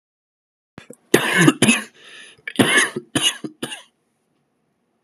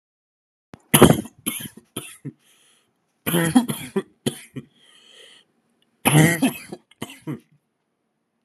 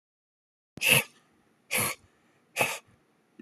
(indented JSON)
{
  "cough_length": "5.0 s",
  "cough_amplitude": 32768,
  "cough_signal_mean_std_ratio": 0.38,
  "three_cough_length": "8.4 s",
  "three_cough_amplitude": 32768,
  "three_cough_signal_mean_std_ratio": 0.31,
  "exhalation_length": "3.4 s",
  "exhalation_amplitude": 18481,
  "exhalation_signal_mean_std_ratio": 0.32,
  "survey_phase": "alpha (2021-03-01 to 2021-08-12)",
  "age": "18-44",
  "gender": "Male",
  "wearing_mask": "No",
  "symptom_fatigue": true,
  "symptom_fever_high_temperature": true,
  "symptom_headache": true,
  "symptom_change_to_sense_of_smell_or_taste": true,
  "smoker_status": "Never smoked",
  "respiratory_condition_asthma": false,
  "respiratory_condition_other": false,
  "recruitment_source": "Test and Trace",
  "submission_delay": "1 day",
  "covid_test_result": "Positive",
  "covid_test_method": "RT-qPCR",
  "covid_ct_value": 29.6,
  "covid_ct_gene": "N gene",
  "covid_ct_mean": 30.5,
  "covid_viral_load": "100 copies/ml",
  "covid_viral_load_category": "Minimal viral load (< 10K copies/ml)"
}